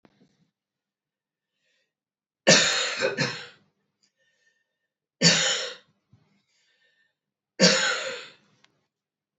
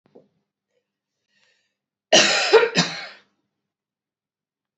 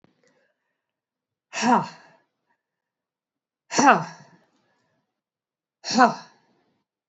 {"three_cough_length": "9.4 s", "three_cough_amplitude": 28064, "three_cough_signal_mean_std_ratio": 0.32, "cough_length": "4.8 s", "cough_amplitude": 28647, "cough_signal_mean_std_ratio": 0.29, "exhalation_length": "7.1 s", "exhalation_amplitude": 28188, "exhalation_signal_mean_std_ratio": 0.25, "survey_phase": "beta (2021-08-13 to 2022-03-07)", "age": "45-64", "gender": "Female", "wearing_mask": "No", "symptom_runny_or_blocked_nose": true, "symptom_sore_throat": true, "symptom_headache": true, "symptom_onset": "4 days", "smoker_status": "Never smoked", "respiratory_condition_asthma": true, "respiratory_condition_other": false, "recruitment_source": "Test and Trace", "submission_delay": "2 days", "covid_test_result": "Positive", "covid_test_method": "RT-qPCR", "covid_ct_value": 20.2, "covid_ct_gene": "ORF1ab gene", "covid_ct_mean": 20.5, "covid_viral_load": "190000 copies/ml", "covid_viral_load_category": "Low viral load (10K-1M copies/ml)"}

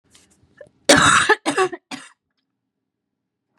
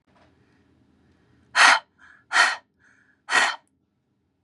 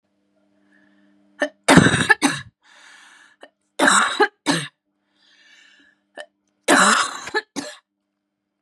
{"cough_length": "3.6 s", "cough_amplitude": 32768, "cough_signal_mean_std_ratio": 0.34, "exhalation_length": "4.4 s", "exhalation_amplitude": 27450, "exhalation_signal_mean_std_ratio": 0.3, "three_cough_length": "8.6 s", "three_cough_amplitude": 32768, "three_cough_signal_mean_std_ratio": 0.35, "survey_phase": "beta (2021-08-13 to 2022-03-07)", "age": "18-44", "gender": "Female", "wearing_mask": "No", "symptom_cough_any": true, "symptom_runny_or_blocked_nose": true, "symptom_shortness_of_breath": true, "symptom_sore_throat": true, "symptom_fatigue": true, "symptom_onset": "5 days", "smoker_status": "Never smoked", "respiratory_condition_asthma": false, "respiratory_condition_other": false, "recruitment_source": "Test and Trace", "submission_delay": "2 days", "covid_test_result": "Positive", "covid_test_method": "RT-qPCR", "covid_ct_value": 27.4, "covid_ct_gene": "ORF1ab gene"}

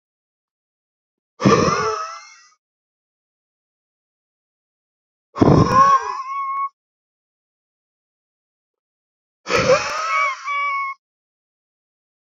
{"exhalation_length": "12.3 s", "exhalation_amplitude": 29269, "exhalation_signal_mean_std_ratio": 0.38, "survey_phase": "beta (2021-08-13 to 2022-03-07)", "age": "45-64", "gender": "Male", "wearing_mask": "No", "symptom_cough_any": true, "symptom_runny_or_blocked_nose": true, "symptom_shortness_of_breath": true, "smoker_status": "Ex-smoker", "respiratory_condition_asthma": false, "respiratory_condition_other": false, "recruitment_source": "Test and Trace", "submission_delay": "1 day", "covid_test_result": "Positive", "covid_test_method": "RT-qPCR", "covid_ct_value": 21.4, "covid_ct_gene": "ORF1ab gene", "covid_ct_mean": 21.8, "covid_viral_load": "72000 copies/ml", "covid_viral_load_category": "Low viral load (10K-1M copies/ml)"}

